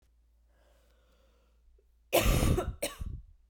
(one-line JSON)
{"cough_length": "3.5 s", "cough_amplitude": 8351, "cough_signal_mean_std_ratio": 0.39, "survey_phase": "beta (2021-08-13 to 2022-03-07)", "age": "18-44", "gender": "Female", "wearing_mask": "Yes", "symptom_new_continuous_cough": true, "symptom_runny_or_blocked_nose": true, "symptom_sore_throat": true, "symptom_fever_high_temperature": true, "symptom_headache": true, "symptom_loss_of_taste": true, "symptom_onset": "4 days", "smoker_status": "Never smoked", "respiratory_condition_asthma": false, "respiratory_condition_other": false, "recruitment_source": "Test and Trace", "submission_delay": "3 days", "covid_test_result": "Positive", "covid_test_method": "RT-qPCR", "covid_ct_value": 19.4, "covid_ct_gene": "ORF1ab gene", "covid_ct_mean": 20.6, "covid_viral_load": "170000 copies/ml", "covid_viral_load_category": "Low viral load (10K-1M copies/ml)"}